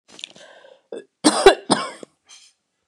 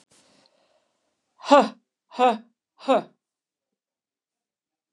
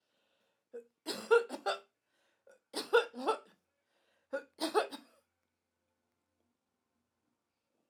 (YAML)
cough_length: 2.9 s
cough_amplitude: 29204
cough_signal_mean_std_ratio: 0.28
exhalation_length: 4.9 s
exhalation_amplitude: 27140
exhalation_signal_mean_std_ratio: 0.24
three_cough_length: 7.9 s
three_cough_amplitude: 6128
three_cough_signal_mean_std_ratio: 0.27
survey_phase: alpha (2021-03-01 to 2021-08-12)
age: 45-64
gender: Female
wearing_mask: 'No'
symptom_none: true
smoker_status: Never smoked
respiratory_condition_asthma: false
respiratory_condition_other: false
recruitment_source: REACT
submission_delay: 1 day
covid_test_result: Negative
covid_test_method: RT-qPCR